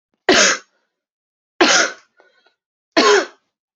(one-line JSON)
{"three_cough_length": "3.8 s", "three_cough_amplitude": 32767, "three_cough_signal_mean_std_ratio": 0.4, "survey_phase": "beta (2021-08-13 to 2022-03-07)", "age": "18-44", "gender": "Female", "wearing_mask": "No", "symptom_cough_any": true, "symptom_runny_or_blocked_nose": true, "symptom_diarrhoea": true, "symptom_fatigue": true, "symptom_headache": true, "symptom_other": true, "symptom_onset": "2 days", "smoker_status": "Ex-smoker", "respiratory_condition_asthma": false, "respiratory_condition_other": false, "recruitment_source": "Test and Trace", "submission_delay": "1 day", "covid_test_result": "Positive", "covid_test_method": "RT-qPCR", "covid_ct_value": 19.1, "covid_ct_gene": "ORF1ab gene", "covid_ct_mean": 19.5, "covid_viral_load": "410000 copies/ml", "covid_viral_load_category": "Low viral load (10K-1M copies/ml)"}